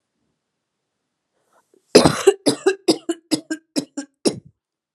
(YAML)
cough_length: 4.9 s
cough_amplitude: 32768
cough_signal_mean_std_ratio: 0.29
survey_phase: alpha (2021-03-01 to 2021-08-12)
age: 18-44
gender: Female
wearing_mask: 'No'
symptom_cough_any: true
symptom_diarrhoea: true
symptom_headache: true
symptom_change_to_sense_of_smell_or_taste: true
symptom_loss_of_taste: true
symptom_onset: 12 days
smoker_status: Ex-smoker
respiratory_condition_asthma: false
respiratory_condition_other: false
recruitment_source: Test and Trace
submission_delay: 2 days
covid_test_result: Positive
covid_test_method: RT-qPCR
covid_ct_value: 17.2
covid_ct_gene: N gene
covid_ct_mean: 18.0
covid_viral_load: 1300000 copies/ml
covid_viral_load_category: High viral load (>1M copies/ml)